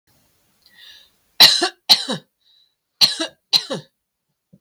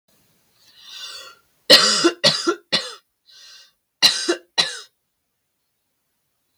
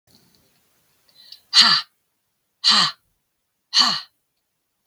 {"three_cough_length": "4.6 s", "three_cough_amplitude": 32768, "three_cough_signal_mean_std_ratio": 0.29, "cough_length": "6.6 s", "cough_amplitude": 32768, "cough_signal_mean_std_ratio": 0.33, "exhalation_length": "4.9 s", "exhalation_amplitude": 32768, "exhalation_signal_mean_std_ratio": 0.31, "survey_phase": "beta (2021-08-13 to 2022-03-07)", "age": "45-64", "gender": "Female", "wearing_mask": "No", "symptom_none": true, "smoker_status": "Ex-smoker", "respiratory_condition_asthma": false, "respiratory_condition_other": false, "recruitment_source": "REACT", "submission_delay": "2 days", "covid_test_result": "Negative", "covid_test_method": "RT-qPCR", "covid_ct_value": 39.0, "covid_ct_gene": "N gene", "influenza_a_test_result": "Negative", "influenza_b_test_result": "Negative"}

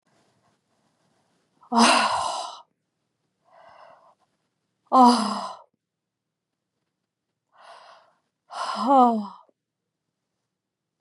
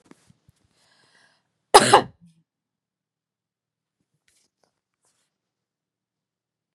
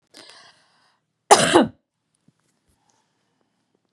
{"exhalation_length": "11.0 s", "exhalation_amplitude": 22917, "exhalation_signal_mean_std_ratio": 0.3, "cough_length": "6.7 s", "cough_amplitude": 32768, "cough_signal_mean_std_ratio": 0.14, "three_cough_length": "3.9 s", "three_cough_amplitude": 32768, "three_cough_signal_mean_std_ratio": 0.22, "survey_phase": "beta (2021-08-13 to 2022-03-07)", "age": "45-64", "gender": "Female", "wearing_mask": "No", "symptom_none": true, "smoker_status": "Ex-smoker", "respiratory_condition_asthma": false, "respiratory_condition_other": false, "recruitment_source": "REACT", "submission_delay": "1 day", "covid_test_result": "Negative", "covid_test_method": "RT-qPCR", "influenza_a_test_result": "Negative", "influenza_b_test_result": "Negative"}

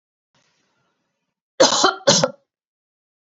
{"cough_length": "3.3 s", "cough_amplitude": 32767, "cough_signal_mean_std_ratio": 0.3, "survey_phase": "beta (2021-08-13 to 2022-03-07)", "age": "45-64", "gender": "Female", "wearing_mask": "No", "symptom_none": true, "smoker_status": "Ex-smoker", "respiratory_condition_asthma": false, "respiratory_condition_other": false, "recruitment_source": "REACT", "submission_delay": "1 day", "covid_test_result": "Negative", "covid_test_method": "RT-qPCR", "influenza_a_test_result": "Negative", "influenza_b_test_result": "Negative"}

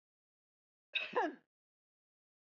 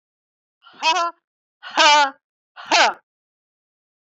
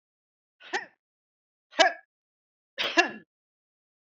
{"cough_length": "2.5 s", "cough_amplitude": 2394, "cough_signal_mean_std_ratio": 0.27, "exhalation_length": "4.2 s", "exhalation_amplitude": 30432, "exhalation_signal_mean_std_ratio": 0.33, "three_cough_length": "4.0 s", "three_cough_amplitude": 26344, "three_cough_signal_mean_std_ratio": 0.23, "survey_phase": "beta (2021-08-13 to 2022-03-07)", "age": "65+", "gender": "Female", "wearing_mask": "No", "symptom_cough_any": true, "symptom_change_to_sense_of_smell_or_taste": true, "smoker_status": "Never smoked", "respiratory_condition_asthma": false, "respiratory_condition_other": false, "recruitment_source": "Test and Trace", "submission_delay": "3 days", "covid_test_result": "Positive", "covid_test_method": "RT-qPCR", "covid_ct_value": 23.2, "covid_ct_gene": "N gene", "covid_ct_mean": 23.6, "covid_viral_load": "18000 copies/ml", "covid_viral_load_category": "Low viral load (10K-1M copies/ml)"}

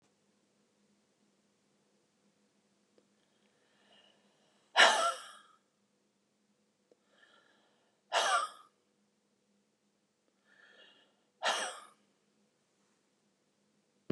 {"exhalation_length": "14.1 s", "exhalation_amplitude": 10488, "exhalation_signal_mean_std_ratio": 0.21, "survey_phase": "beta (2021-08-13 to 2022-03-07)", "age": "65+", "gender": "Female", "wearing_mask": "No", "symptom_none": true, "smoker_status": "Ex-smoker", "respiratory_condition_asthma": false, "respiratory_condition_other": false, "recruitment_source": "REACT", "submission_delay": "2 days", "covid_test_result": "Negative", "covid_test_method": "RT-qPCR", "influenza_a_test_result": "Negative", "influenza_b_test_result": "Negative"}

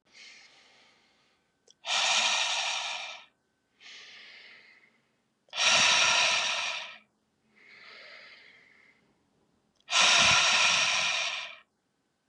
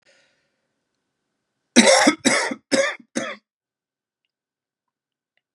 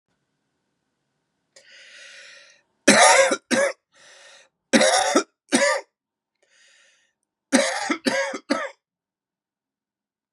{"exhalation_length": "12.3 s", "exhalation_amplitude": 10619, "exhalation_signal_mean_std_ratio": 0.49, "cough_length": "5.5 s", "cough_amplitude": 32767, "cough_signal_mean_std_ratio": 0.31, "three_cough_length": "10.3 s", "three_cough_amplitude": 32358, "three_cough_signal_mean_std_ratio": 0.36, "survey_phase": "beta (2021-08-13 to 2022-03-07)", "age": "18-44", "gender": "Male", "wearing_mask": "No", "symptom_cough_any": true, "symptom_runny_or_blocked_nose": true, "symptom_sore_throat": true, "symptom_fatigue": true, "symptom_headache": true, "symptom_onset": "3 days", "smoker_status": "Ex-smoker", "respiratory_condition_asthma": false, "respiratory_condition_other": false, "recruitment_source": "Test and Trace", "submission_delay": "2 days", "covid_test_result": "Positive", "covid_test_method": "RT-qPCR", "covid_ct_value": 16.4, "covid_ct_gene": "N gene"}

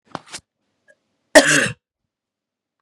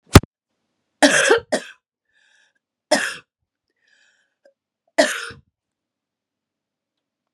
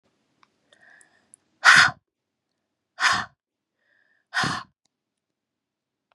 {"cough_length": "2.8 s", "cough_amplitude": 32768, "cough_signal_mean_std_ratio": 0.25, "three_cough_length": "7.3 s", "three_cough_amplitude": 32768, "three_cough_signal_mean_std_ratio": 0.24, "exhalation_length": "6.1 s", "exhalation_amplitude": 29266, "exhalation_signal_mean_std_ratio": 0.24, "survey_phase": "beta (2021-08-13 to 2022-03-07)", "age": "18-44", "gender": "Female", "wearing_mask": "No", "symptom_cough_any": true, "symptom_runny_or_blocked_nose": true, "symptom_sore_throat": true, "symptom_change_to_sense_of_smell_or_taste": true, "symptom_loss_of_taste": true, "smoker_status": "Never smoked", "respiratory_condition_asthma": false, "respiratory_condition_other": false, "recruitment_source": "Test and Trace", "submission_delay": "2 days", "covid_test_result": "Positive", "covid_test_method": "RT-qPCR", "covid_ct_value": 20.9, "covid_ct_gene": "ORF1ab gene", "covid_ct_mean": 20.9, "covid_viral_load": "140000 copies/ml", "covid_viral_load_category": "Low viral load (10K-1M copies/ml)"}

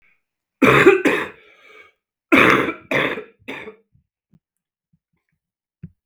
{"cough_length": "6.1 s", "cough_amplitude": 32768, "cough_signal_mean_std_ratio": 0.35, "survey_phase": "beta (2021-08-13 to 2022-03-07)", "age": "45-64", "gender": "Male", "wearing_mask": "No", "symptom_cough_any": true, "symptom_runny_or_blocked_nose": true, "symptom_headache": true, "symptom_change_to_sense_of_smell_or_taste": true, "symptom_onset": "3 days", "smoker_status": "Current smoker (e-cigarettes or vapes only)", "respiratory_condition_asthma": false, "respiratory_condition_other": false, "recruitment_source": "Test and Trace", "submission_delay": "1 day", "covid_test_result": "Positive", "covid_test_method": "RT-qPCR", "covid_ct_value": 18.0, "covid_ct_gene": "N gene", "covid_ct_mean": 18.1, "covid_viral_load": "1200000 copies/ml", "covid_viral_load_category": "High viral load (>1M copies/ml)"}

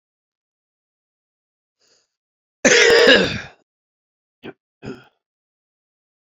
{"cough_length": "6.3 s", "cough_amplitude": 32767, "cough_signal_mean_std_ratio": 0.28, "survey_phase": "beta (2021-08-13 to 2022-03-07)", "age": "45-64", "gender": "Male", "wearing_mask": "No", "symptom_cough_any": true, "symptom_runny_or_blocked_nose": true, "symptom_sore_throat": true, "symptom_abdominal_pain": true, "symptom_fatigue": true, "symptom_fever_high_temperature": true, "symptom_headache": true, "symptom_change_to_sense_of_smell_or_taste": true, "symptom_loss_of_taste": true, "symptom_onset": "2 days", "smoker_status": "Never smoked", "respiratory_condition_asthma": false, "respiratory_condition_other": false, "recruitment_source": "Test and Trace", "submission_delay": "1 day", "covid_test_result": "Positive", "covid_test_method": "RT-qPCR", "covid_ct_value": 23.7, "covid_ct_gene": "ORF1ab gene", "covid_ct_mean": 24.4, "covid_viral_load": "10000 copies/ml", "covid_viral_load_category": "Minimal viral load (< 10K copies/ml)"}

